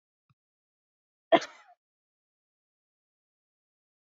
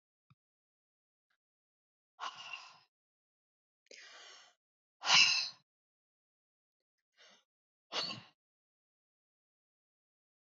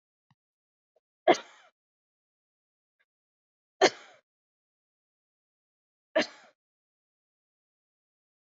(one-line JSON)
{"cough_length": "4.2 s", "cough_amplitude": 12755, "cough_signal_mean_std_ratio": 0.11, "exhalation_length": "10.4 s", "exhalation_amplitude": 8170, "exhalation_signal_mean_std_ratio": 0.2, "three_cough_length": "8.5 s", "three_cough_amplitude": 14137, "three_cough_signal_mean_std_ratio": 0.13, "survey_phase": "beta (2021-08-13 to 2022-03-07)", "age": "65+", "gender": "Female", "wearing_mask": "No", "symptom_none": true, "smoker_status": "Never smoked", "respiratory_condition_asthma": false, "respiratory_condition_other": false, "recruitment_source": "REACT", "submission_delay": "2 days", "covid_test_result": "Negative", "covid_test_method": "RT-qPCR", "influenza_a_test_result": "Negative", "influenza_b_test_result": "Negative"}